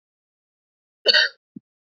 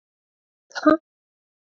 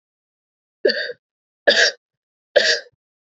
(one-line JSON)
{"cough_length": "2.0 s", "cough_amplitude": 26874, "cough_signal_mean_std_ratio": 0.25, "exhalation_length": "1.8 s", "exhalation_amplitude": 22676, "exhalation_signal_mean_std_ratio": 0.2, "three_cough_length": "3.2 s", "three_cough_amplitude": 28798, "three_cough_signal_mean_std_ratio": 0.34, "survey_phase": "beta (2021-08-13 to 2022-03-07)", "age": "18-44", "gender": "Female", "wearing_mask": "No", "symptom_none": true, "smoker_status": "Ex-smoker", "respiratory_condition_asthma": false, "respiratory_condition_other": false, "recruitment_source": "REACT", "submission_delay": "1 day", "covid_test_result": "Negative", "covid_test_method": "RT-qPCR", "influenza_a_test_result": "Negative", "influenza_b_test_result": "Negative"}